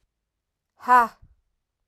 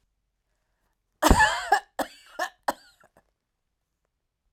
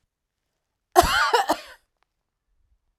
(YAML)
exhalation_length: 1.9 s
exhalation_amplitude: 18969
exhalation_signal_mean_std_ratio: 0.25
three_cough_length: 4.5 s
three_cough_amplitude: 22786
three_cough_signal_mean_std_ratio: 0.27
cough_length: 3.0 s
cough_amplitude: 32767
cough_signal_mean_std_ratio: 0.32
survey_phase: alpha (2021-03-01 to 2021-08-12)
age: 45-64
gender: Female
wearing_mask: 'No'
symptom_shortness_of_breath: true
symptom_fatigue: true
symptom_onset: 12 days
smoker_status: Ex-smoker
respiratory_condition_asthma: false
respiratory_condition_other: false
recruitment_source: REACT
submission_delay: 1 day
covid_test_result: Negative
covid_test_method: RT-qPCR